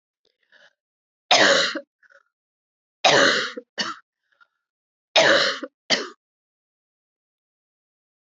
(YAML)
three_cough_length: 8.3 s
three_cough_amplitude: 26314
three_cough_signal_mean_std_ratio: 0.34
survey_phase: beta (2021-08-13 to 2022-03-07)
age: 65+
gender: Female
wearing_mask: 'No'
symptom_runny_or_blocked_nose: true
symptom_change_to_sense_of_smell_or_taste: true
symptom_loss_of_taste: true
symptom_onset: 4 days
smoker_status: Never smoked
respiratory_condition_asthma: false
respiratory_condition_other: false
recruitment_source: Test and Trace
submission_delay: 2 days
covid_test_result: Positive
covid_test_method: RT-qPCR